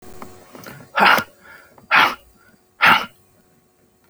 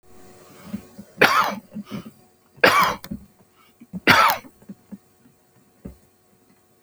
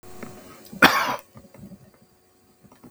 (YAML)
exhalation_length: 4.1 s
exhalation_amplitude: 28919
exhalation_signal_mean_std_ratio: 0.36
three_cough_length: 6.8 s
three_cough_amplitude: 32768
three_cough_signal_mean_std_ratio: 0.34
cough_length: 2.9 s
cough_amplitude: 29996
cough_signal_mean_std_ratio: 0.29
survey_phase: alpha (2021-03-01 to 2021-08-12)
age: 45-64
gender: Male
wearing_mask: 'No'
symptom_none: true
symptom_onset: 13 days
smoker_status: Never smoked
respiratory_condition_asthma: false
respiratory_condition_other: false
recruitment_source: REACT
submission_delay: 5 days
covid_test_result: Negative
covid_test_method: RT-qPCR